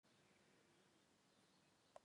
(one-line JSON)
{"three_cough_length": "2.0 s", "three_cough_amplitude": 161, "three_cough_signal_mean_std_ratio": 0.75, "survey_phase": "beta (2021-08-13 to 2022-03-07)", "age": "45-64", "gender": "Female", "wearing_mask": "No", "symptom_fatigue": true, "smoker_status": "Never smoked", "respiratory_condition_asthma": true, "respiratory_condition_other": false, "recruitment_source": "Test and Trace", "submission_delay": "2 days", "covid_test_result": "Negative", "covid_test_method": "LAMP"}